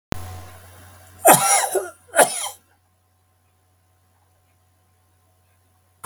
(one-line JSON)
{"cough_length": "6.1 s", "cough_amplitude": 32768, "cough_signal_mean_std_ratio": 0.29, "survey_phase": "beta (2021-08-13 to 2022-03-07)", "age": "65+", "gender": "Male", "wearing_mask": "No", "symptom_diarrhoea": true, "smoker_status": "Never smoked", "respiratory_condition_asthma": false, "respiratory_condition_other": false, "recruitment_source": "REACT", "submission_delay": "2 days", "covid_test_result": "Negative", "covid_test_method": "RT-qPCR", "influenza_a_test_result": "Negative", "influenza_b_test_result": "Negative"}